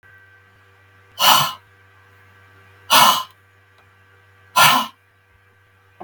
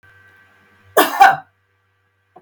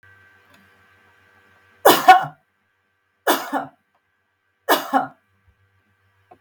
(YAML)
exhalation_length: 6.0 s
exhalation_amplitude: 32768
exhalation_signal_mean_std_ratio: 0.32
cough_length: 2.4 s
cough_amplitude: 32768
cough_signal_mean_std_ratio: 0.29
three_cough_length: 6.4 s
three_cough_amplitude: 32768
three_cough_signal_mean_std_ratio: 0.26
survey_phase: beta (2021-08-13 to 2022-03-07)
age: 65+
gender: Female
wearing_mask: 'No'
symptom_none: true
smoker_status: Ex-smoker
respiratory_condition_asthma: false
respiratory_condition_other: false
recruitment_source: REACT
submission_delay: 2 days
covid_test_result: Negative
covid_test_method: RT-qPCR